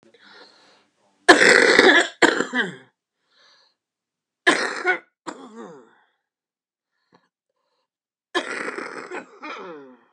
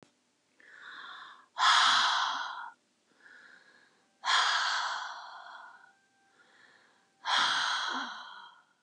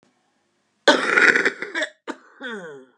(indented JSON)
{
  "three_cough_length": "10.1 s",
  "three_cough_amplitude": 32768,
  "three_cough_signal_mean_std_ratio": 0.32,
  "exhalation_length": "8.8 s",
  "exhalation_amplitude": 8478,
  "exhalation_signal_mean_std_ratio": 0.49,
  "cough_length": "3.0 s",
  "cough_amplitude": 32651,
  "cough_signal_mean_std_ratio": 0.41,
  "survey_phase": "beta (2021-08-13 to 2022-03-07)",
  "age": "45-64",
  "gender": "Female",
  "wearing_mask": "No",
  "symptom_none": true,
  "smoker_status": "Never smoked",
  "respiratory_condition_asthma": true,
  "respiratory_condition_other": false,
  "recruitment_source": "REACT",
  "submission_delay": "1 day",
  "covid_test_result": "Negative",
  "covid_test_method": "RT-qPCR"
}